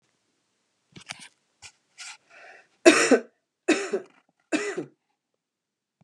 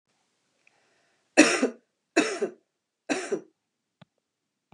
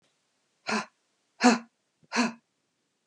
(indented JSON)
{
  "cough_length": "6.0 s",
  "cough_amplitude": 29975,
  "cough_signal_mean_std_ratio": 0.26,
  "three_cough_length": "4.7 s",
  "three_cough_amplitude": 29326,
  "three_cough_signal_mean_std_ratio": 0.28,
  "exhalation_length": "3.1 s",
  "exhalation_amplitude": 16772,
  "exhalation_signal_mean_std_ratio": 0.29,
  "survey_phase": "beta (2021-08-13 to 2022-03-07)",
  "age": "45-64",
  "gender": "Female",
  "wearing_mask": "No",
  "symptom_runny_or_blocked_nose": true,
  "symptom_sore_throat": true,
  "symptom_headache": true,
  "smoker_status": "Ex-smoker",
  "respiratory_condition_asthma": false,
  "respiratory_condition_other": false,
  "recruitment_source": "REACT",
  "submission_delay": "1 day",
  "covid_test_result": "Negative",
  "covid_test_method": "RT-qPCR",
  "influenza_a_test_result": "Negative",
  "influenza_b_test_result": "Negative"
}